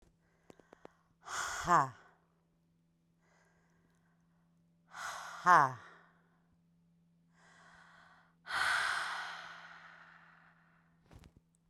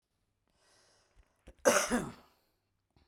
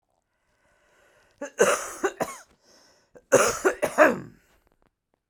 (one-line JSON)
{"exhalation_length": "11.7 s", "exhalation_amplitude": 8446, "exhalation_signal_mean_std_ratio": 0.28, "cough_length": "3.1 s", "cough_amplitude": 10553, "cough_signal_mean_std_ratio": 0.27, "three_cough_length": "5.3 s", "three_cough_amplitude": 23047, "three_cough_signal_mean_std_ratio": 0.34, "survey_phase": "beta (2021-08-13 to 2022-03-07)", "age": "45-64", "gender": "Female", "wearing_mask": "No", "symptom_diarrhoea": true, "symptom_change_to_sense_of_smell_or_taste": true, "symptom_loss_of_taste": true, "symptom_onset": "3 days", "smoker_status": "Current smoker (1 to 10 cigarettes per day)", "respiratory_condition_asthma": false, "respiratory_condition_other": false, "recruitment_source": "Test and Trace", "submission_delay": "2 days", "covid_test_result": "Positive", "covid_test_method": "ePCR"}